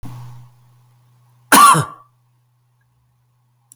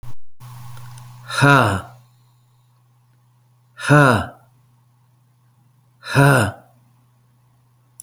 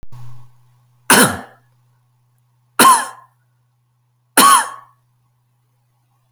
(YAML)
cough_length: 3.8 s
cough_amplitude: 32768
cough_signal_mean_std_ratio: 0.27
exhalation_length: 8.0 s
exhalation_amplitude: 30290
exhalation_signal_mean_std_ratio: 0.37
three_cough_length: 6.3 s
three_cough_amplitude: 32768
three_cough_signal_mean_std_ratio: 0.32
survey_phase: beta (2021-08-13 to 2022-03-07)
age: 45-64
gender: Male
wearing_mask: 'No'
symptom_none: true
smoker_status: Never smoked
respiratory_condition_asthma: false
respiratory_condition_other: false
recruitment_source: REACT
submission_delay: 1 day
covid_test_result: Negative
covid_test_method: RT-qPCR